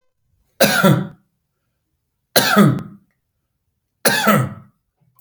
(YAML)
three_cough_length: 5.2 s
three_cough_amplitude: 32768
three_cough_signal_mean_std_ratio: 0.4
survey_phase: beta (2021-08-13 to 2022-03-07)
age: 65+
gender: Male
wearing_mask: 'No'
symptom_none: true
smoker_status: Ex-smoker
respiratory_condition_asthma: false
respiratory_condition_other: false
recruitment_source: REACT
submission_delay: 2 days
covid_test_result: Negative
covid_test_method: RT-qPCR
influenza_a_test_result: Negative
influenza_b_test_result: Negative